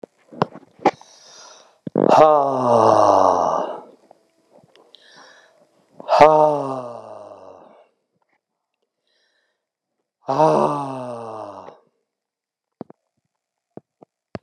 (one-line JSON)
{"exhalation_length": "14.4 s", "exhalation_amplitude": 32768, "exhalation_signal_mean_std_ratio": 0.36, "survey_phase": "beta (2021-08-13 to 2022-03-07)", "age": "65+", "gender": "Male", "wearing_mask": "No", "symptom_none": true, "smoker_status": "Never smoked", "respiratory_condition_asthma": false, "respiratory_condition_other": false, "recruitment_source": "REACT", "submission_delay": "3 days", "covid_test_result": "Negative", "covid_test_method": "RT-qPCR", "influenza_a_test_result": "Unknown/Void", "influenza_b_test_result": "Unknown/Void"}